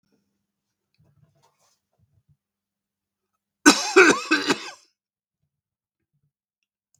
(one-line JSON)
{"cough_length": "7.0 s", "cough_amplitude": 32768, "cough_signal_mean_std_ratio": 0.22, "survey_phase": "beta (2021-08-13 to 2022-03-07)", "age": "65+", "gender": "Male", "wearing_mask": "No", "symptom_cough_any": true, "smoker_status": "Never smoked", "respiratory_condition_asthma": false, "respiratory_condition_other": false, "recruitment_source": "REACT", "submission_delay": "1 day", "covid_test_result": "Negative", "covid_test_method": "RT-qPCR"}